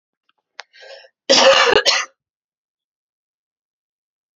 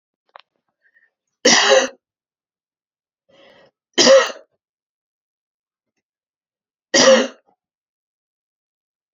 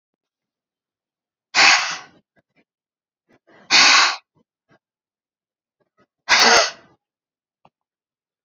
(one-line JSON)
{"cough_length": "4.4 s", "cough_amplitude": 31422, "cough_signal_mean_std_ratio": 0.32, "three_cough_length": "9.1 s", "three_cough_amplitude": 32768, "three_cough_signal_mean_std_ratio": 0.27, "exhalation_length": "8.4 s", "exhalation_amplitude": 32768, "exhalation_signal_mean_std_ratio": 0.3, "survey_phase": "beta (2021-08-13 to 2022-03-07)", "age": "18-44", "gender": "Female", "wearing_mask": "No", "symptom_cough_any": true, "symptom_runny_or_blocked_nose": true, "symptom_shortness_of_breath": true, "symptom_fatigue": true, "symptom_fever_high_temperature": true, "symptom_headache": true, "symptom_change_to_sense_of_smell_or_taste": true, "symptom_loss_of_taste": true, "symptom_onset": "5 days", "smoker_status": "Never smoked", "respiratory_condition_asthma": true, "respiratory_condition_other": false, "recruitment_source": "Test and Trace", "submission_delay": "2 days", "covid_test_result": "Positive", "covid_test_method": "RT-qPCR", "covid_ct_value": 15.1, "covid_ct_gene": "N gene", "covid_ct_mean": 15.5, "covid_viral_load": "8000000 copies/ml", "covid_viral_load_category": "High viral load (>1M copies/ml)"}